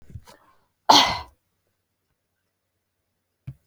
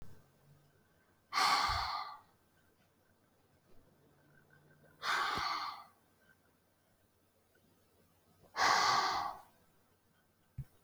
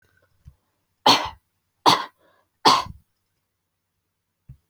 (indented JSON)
{
  "cough_length": "3.7 s",
  "cough_amplitude": 27898,
  "cough_signal_mean_std_ratio": 0.21,
  "exhalation_length": "10.8 s",
  "exhalation_amplitude": 3953,
  "exhalation_signal_mean_std_ratio": 0.39,
  "three_cough_length": "4.7 s",
  "three_cough_amplitude": 26696,
  "three_cough_signal_mean_std_ratio": 0.26,
  "survey_phase": "alpha (2021-03-01 to 2021-08-12)",
  "age": "18-44",
  "gender": "Female",
  "wearing_mask": "No",
  "symptom_none": true,
  "smoker_status": "Never smoked",
  "respiratory_condition_asthma": false,
  "respiratory_condition_other": false,
  "recruitment_source": "REACT",
  "submission_delay": "21 days",
  "covid_test_result": "Negative",
  "covid_test_method": "RT-qPCR"
}